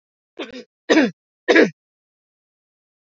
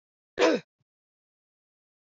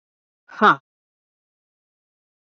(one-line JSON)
{"three_cough_length": "3.1 s", "three_cough_amplitude": 28301, "three_cough_signal_mean_std_ratio": 0.3, "cough_length": "2.1 s", "cough_amplitude": 11499, "cough_signal_mean_std_ratio": 0.24, "exhalation_length": "2.6 s", "exhalation_amplitude": 25829, "exhalation_signal_mean_std_ratio": 0.18, "survey_phase": "beta (2021-08-13 to 2022-03-07)", "age": "45-64", "gender": "Female", "wearing_mask": "No", "symptom_cough_any": true, "symptom_runny_or_blocked_nose": true, "symptom_shortness_of_breath": true, "symptom_sore_throat": true, "symptom_abdominal_pain": true, "symptom_fatigue": true, "symptom_headache": true, "smoker_status": "Never smoked", "respiratory_condition_asthma": true, "respiratory_condition_other": false, "recruitment_source": "REACT", "submission_delay": "1 day", "covid_test_result": "Negative", "covid_test_method": "RT-qPCR"}